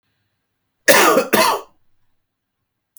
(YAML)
cough_length: 3.0 s
cough_amplitude: 32768
cough_signal_mean_std_ratio: 0.37
survey_phase: beta (2021-08-13 to 2022-03-07)
age: 45-64
gender: Female
wearing_mask: 'No'
symptom_none: true
smoker_status: Never smoked
respiratory_condition_asthma: false
respiratory_condition_other: false
recruitment_source: Test and Trace
submission_delay: -4 days
covid_test_result: Negative
covid_test_method: LFT